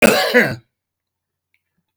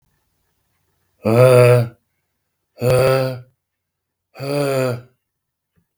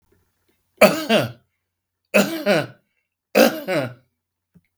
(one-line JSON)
{"cough_length": "2.0 s", "cough_amplitude": 32768, "cough_signal_mean_std_ratio": 0.39, "exhalation_length": "6.0 s", "exhalation_amplitude": 32766, "exhalation_signal_mean_std_ratio": 0.41, "three_cough_length": "4.8 s", "three_cough_amplitude": 32768, "three_cough_signal_mean_std_ratio": 0.38, "survey_phase": "beta (2021-08-13 to 2022-03-07)", "age": "65+", "gender": "Male", "wearing_mask": "No", "symptom_none": true, "smoker_status": "Ex-smoker", "respiratory_condition_asthma": false, "respiratory_condition_other": false, "recruitment_source": "REACT", "submission_delay": "1 day", "covid_test_result": "Negative", "covid_test_method": "RT-qPCR", "influenza_a_test_result": "Unknown/Void", "influenza_b_test_result": "Unknown/Void"}